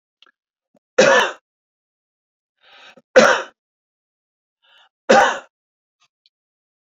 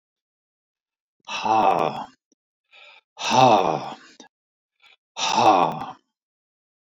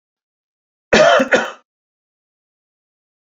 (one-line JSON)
{"three_cough_length": "6.8 s", "three_cough_amplitude": 31079, "three_cough_signal_mean_std_ratio": 0.27, "exhalation_length": "6.8 s", "exhalation_amplitude": 23396, "exhalation_signal_mean_std_ratio": 0.4, "cough_length": "3.3 s", "cough_amplitude": 30234, "cough_signal_mean_std_ratio": 0.31, "survey_phase": "beta (2021-08-13 to 2022-03-07)", "age": "65+", "gender": "Male", "wearing_mask": "No", "symptom_none": true, "smoker_status": "Never smoked", "respiratory_condition_asthma": false, "respiratory_condition_other": false, "recruitment_source": "REACT", "submission_delay": "4 days", "covid_test_result": "Negative", "covid_test_method": "RT-qPCR"}